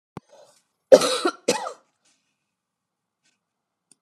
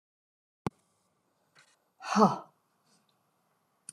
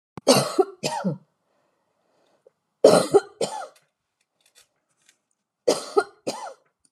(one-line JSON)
{"cough_length": "4.0 s", "cough_amplitude": 32768, "cough_signal_mean_std_ratio": 0.21, "exhalation_length": "3.9 s", "exhalation_amplitude": 12647, "exhalation_signal_mean_std_ratio": 0.2, "three_cough_length": "6.9 s", "three_cough_amplitude": 30909, "three_cough_signal_mean_std_ratio": 0.31, "survey_phase": "alpha (2021-03-01 to 2021-08-12)", "age": "65+", "gender": "Female", "wearing_mask": "No", "symptom_none": true, "smoker_status": "Ex-smoker", "respiratory_condition_asthma": false, "respiratory_condition_other": false, "recruitment_source": "REACT", "submission_delay": "6 days", "covid_test_result": "Negative", "covid_test_method": "RT-qPCR"}